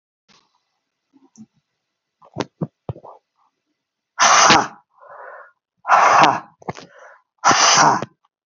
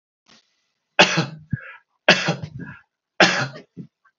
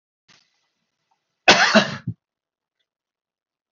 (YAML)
exhalation_length: 8.5 s
exhalation_amplitude: 32509
exhalation_signal_mean_std_ratio: 0.37
three_cough_length: 4.2 s
three_cough_amplitude: 32768
three_cough_signal_mean_std_ratio: 0.34
cough_length: 3.7 s
cough_amplitude: 29623
cough_signal_mean_std_ratio: 0.25
survey_phase: beta (2021-08-13 to 2022-03-07)
age: 65+
gender: Male
wearing_mask: 'No'
symptom_none: true
smoker_status: Never smoked
respiratory_condition_asthma: false
respiratory_condition_other: false
recruitment_source: REACT
submission_delay: 1 day
covid_test_result: Negative
covid_test_method: RT-qPCR